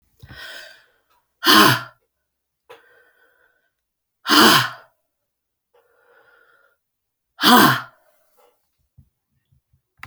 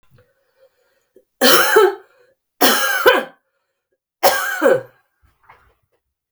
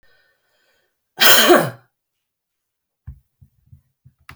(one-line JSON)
{"exhalation_length": "10.1 s", "exhalation_amplitude": 32767, "exhalation_signal_mean_std_ratio": 0.27, "three_cough_length": "6.3 s", "three_cough_amplitude": 32768, "three_cough_signal_mean_std_ratio": 0.41, "cough_length": "4.4 s", "cough_amplitude": 32768, "cough_signal_mean_std_ratio": 0.27, "survey_phase": "beta (2021-08-13 to 2022-03-07)", "age": "65+", "gender": "Female", "wearing_mask": "No", "symptom_cough_any": true, "symptom_runny_or_blocked_nose": true, "symptom_headache": true, "symptom_change_to_sense_of_smell_or_taste": true, "symptom_loss_of_taste": true, "symptom_onset": "4 days", "smoker_status": "Ex-smoker", "respiratory_condition_asthma": false, "respiratory_condition_other": false, "recruitment_source": "Test and Trace", "submission_delay": "2 days", "covid_test_result": "Positive", "covid_test_method": "RT-qPCR"}